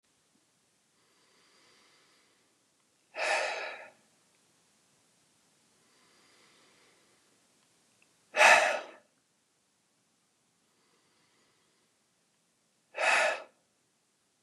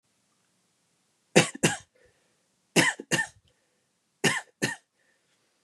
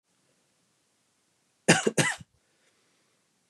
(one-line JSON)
{"exhalation_length": "14.4 s", "exhalation_amplitude": 16537, "exhalation_signal_mean_std_ratio": 0.23, "three_cough_length": "5.6 s", "three_cough_amplitude": 21885, "three_cough_signal_mean_std_ratio": 0.27, "cough_length": "3.5 s", "cough_amplitude": 22835, "cough_signal_mean_std_ratio": 0.23, "survey_phase": "beta (2021-08-13 to 2022-03-07)", "age": "18-44", "gender": "Male", "wearing_mask": "No", "symptom_none": true, "smoker_status": "Never smoked", "respiratory_condition_asthma": false, "respiratory_condition_other": false, "recruitment_source": "REACT", "submission_delay": "4 days", "covid_test_result": "Negative", "covid_test_method": "RT-qPCR"}